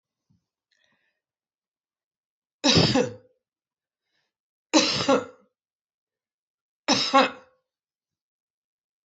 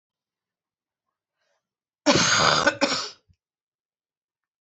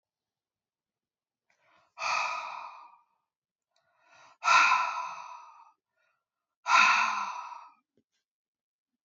{"three_cough_length": "9.0 s", "three_cough_amplitude": 19688, "three_cough_signal_mean_std_ratio": 0.29, "cough_length": "4.6 s", "cough_amplitude": 21017, "cough_signal_mean_std_ratio": 0.34, "exhalation_length": "9.0 s", "exhalation_amplitude": 12659, "exhalation_signal_mean_std_ratio": 0.35, "survey_phase": "alpha (2021-03-01 to 2021-08-12)", "age": "45-64", "gender": "Female", "wearing_mask": "No", "symptom_abdominal_pain": true, "symptom_fatigue": true, "symptom_fever_high_temperature": true, "symptom_onset": "4 days", "smoker_status": "Never smoked", "respiratory_condition_asthma": false, "respiratory_condition_other": false, "recruitment_source": "Test and Trace", "submission_delay": "2 days", "covid_test_result": "Positive", "covid_test_method": "RT-qPCR", "covid_ct_value": 15.1, "covid_ct_gene": "ORF1ab gene", "covid_ct_mean": 15.4, "covid_viral_load": "8700000 copies/ml", "covid_viral_load_category": "High viral load (>1M copies/ml)"}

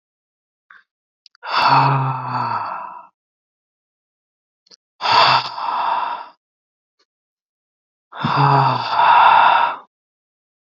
{"exhalation_length": "10.8 s", "exhalation_amplitude": 31135, "exhalation_signal_mean_std_ratio": 0.48, "survey_phase": "beta (2021-08-13 to 2022-03-07)", "age": "18-44", "gender": "Male", "wearing_mask": "No", "symptom_fatigue": true, "smoker_status": "Never smoked", "respiratory_condition_asthma": false, "respiratory_condition_other": false, "recruitment_source": "Test and Trace", "submission_delay": "1 day", "covid_test_result": "Positive", "covid_test_method": "RT-qPCR", "covid_ct_value": 21.2, "covid_ct_gene": "N gene"}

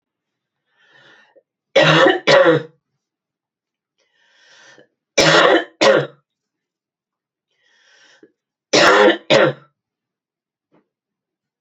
{"three_cough_length": "11.6 s", "three_cough_amplitude": 32768, "three_cough_signal_mean_std_ratio": 0.36, "survey_phase": "beta (2021-08-13 to 2022-03-07)", "age": "45-64", "gender": "Female", "wearing_mask": "No", "symptom_cough_any": true, "symptom_fatigue": true, "symptom_fever_high_temperature": true, "symptom_headache": true, "symptom_change_to_sense_of_smell_or_taste": true, "symptom_loss_of_taste": true, "smoker_status": "Prefer not to say", "respiratory_condition_asthma": false, "respiratory_condition_other": false, "recruitment_source": "Test and Trace", "submission_delay": "2 days", "covid_test_result": "Positive", "covid_test_method": "RT-qPCR", "covid_ct_value": 14.7, "covid_ct_gene": "ORF1ab gene", "covid_ct_mean": 14.9, "covid_viral_load": "13000000 copies/ml", "covid_viral_load_category": "High viral load (>1M copies/ml)"}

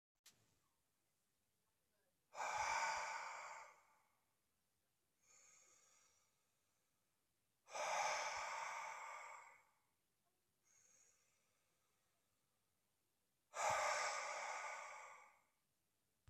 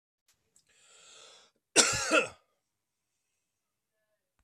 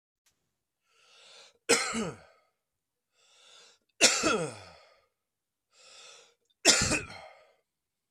{"exhalation_length": "16.3 s", "exhalation_amplitude": 1186, "exhalation_signal_mean_std_ratio": 0.43, "cough_length": "4.4 s", "cough_amplitude": 15159, "cough_signal_mean_std_ratio": 0.25, "three_cough_length": "8.1 s", "three_cough_amplitude": 19940, "three_cough_signal_mean_std_ratio": 0.3, "survey_phase": "beta (2021-08-13 to 2022-03-07)", "age": "45-64", "gender": "Male", "wearing_mask": "No", "symptom_cough_any": true, "smoker_status": "Never smoked", "respiratory_condition_asthma": false, "respiratory_condition_other": false, "recruitment_source": "Test and Trace", "submission_delay": "2 days", "covid_test_result": "Positive", "covid_test_method": "RT-qPCR", "covid_ct_value": 18.9, "covid_ct_gene": "ORF1ab gene", "covid_ct_mean": 18.9, "covid_viral_load": "630000 copies/ml", "covid_viral_load_category": "Low viral load (10K-1M copies/ml)"}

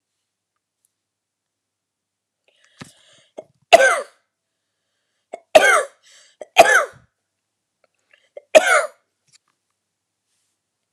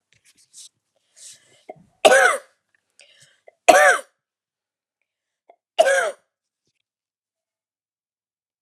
{"cough_length": "10.9 s", "cough_amplitude": 32768, "cough_signal_mean_std_ratio": 0.23, "three_cough_length": "8.6 s", "three_cough_amplitude": 32768, "three_cough_signal_mean_std_ratio": 0.25, "survey_phase": "beta (2021-08-13 to 2022-03-07)", "age": "45-64", "gender": "Female", "wearing_mask": "No", "symptom_cough_any": true, "symptom_runny_or_blocked_nose": true, "symptom_sore_throat": true, "smoker_status": "Never smoked", "respiratory_condition_asthma": false, "respiratory_condition_other": true, "recruitment_source": "REACT", "submission_delay": "1 day", "covid_test_result": "Negative", "covid_test_method": "RT-qPCR"}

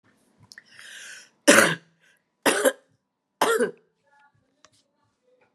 {"three_cough_length": "5.5 s", "three_cough_amplitude": 31057, "three_cough_signal_mean_std_ratio": 0.29, "survey_phase": "beta (2021-08-13 to 2022-03-07)", "age": "18-44", "gender": "Female", "wearing_mask": "No", "symptom_runny_or_blocked_nose": true, "symptom_headache": true, "symptom_change_to_sense_of_smell_or_taste": true, "symptom_loss_of_taste": true, "symptom_onset": "4 days", "smoker_status": "Ex-smoker", "respiratory_condition_asthma": false, "respiratory_condition_other": false, "recruitment_source": "Test and Trace", "submission_delay": "1 day", "covid_test_result": "Positive", "covid_test_method": "RT-qPCR", "covid_ct_value": 22.8, "covid_ct_gene": "ORF1ab gene"}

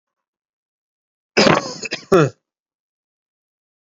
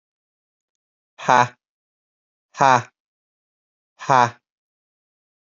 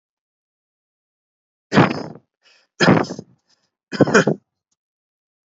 {"cough_length": "3.8 s", "cough_amplitude": 32767, "cough_signal_mean_std_ratio": 0.28, "exhalation_length": "5.5 s", "exhalation_amplitude": 28469, "exhalation_signal_mean_std_ratio": 0.23, "three_cough_length": "5.5 s", "three_cough_amplitude": 29208, "three_cough_signal_mean_std_ratio": 0.29, "survey_phase": "alpha (2021-03-01 to 2021-08-12)", "age": "18-44", "gender": "Male", "wearing_mask": "No", "symptom_fatigue": true, "symptom_fever_high_temperature": true, "symptom_headache": true, "symptom_onset": "3 days", "smoker_status": "Never smoked", "respiratory_condition_asthma": false, "respiratory_condition_other": false, "recruitment_source": "Test and Trace", "submission_delay": "2 days", "covid_test_result": "Positive", "covid_test_method": "RT-qPCR", "covid_ct_value": 25.4, "covid_ct_gene": "ORF1ab gene"}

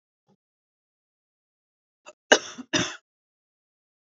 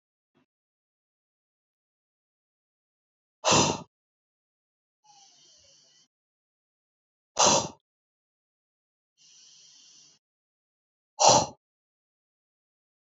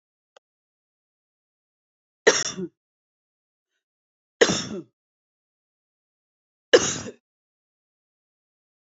{"cough_length": "4.2 s", "cough_amplitude": 32768, "cough_signal_mean_std_ratio": 0.16, "exhalation_length": "13.1 s", "exhalation_amplitude": 21602, "exhalation_signal_mean_std_ratio": 0.2, "three_cough_length": "9.0 s", "three_cough_amplitude": 28767, "three_cough_signal_mean_std_ratio": 0.19, "survey_phase": "beta (2021-08-13 to 2022-03-07)", "age": "45-64", "gender": "Female", "wearing_mask": "Yes", "symptom_none": true, "smoker_status": "Never smoked", "respiratory_condition_asthma": false, "respiratory_condition_other": false, "recruitment_source": "REACT", "submission_delay": "5 days", "covid_test_result": "Negative", "covid_test_method": "RT-qPCR", "influenza_a_test_result": "Negative", "influenza_b_test_result": "Negative"}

